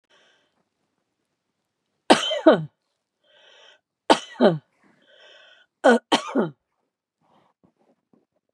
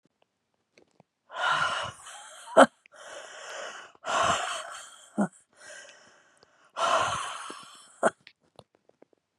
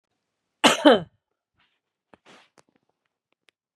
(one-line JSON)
{"three_cough_length": "8.5 s", "three_cough_amplitude": 32767, "three_cough_signal_mean_std_ratio": 0.25, "exhalation_length": "9.4 s", "exhalation_amplitude": 26526, "exhalation_signal_mean_std_ratio": 0.35, "cough_length": "3.8 s", "cough_amplitude": 30466, "cough_signal_mean_std_ratio": 0.2, "survey_phase": "beta (2021-08-13 to 2022-03-07)", "age": "65+", "gender": "Female", "wearing_mask": "No", "symptom_none": true, "smoker_status": "Never smoked", "respiratory_condition_asthma": false, "respiratory_condition_other": false, "recruitment_source": "REACT", "submission_delay": "4 days", "covid_test_result": "Negative", "covid_test_method": "RT-qPCR", "influenza_a_test_result": "Unknown/Void", "influenza_b_test_result": "Unknown/Void"}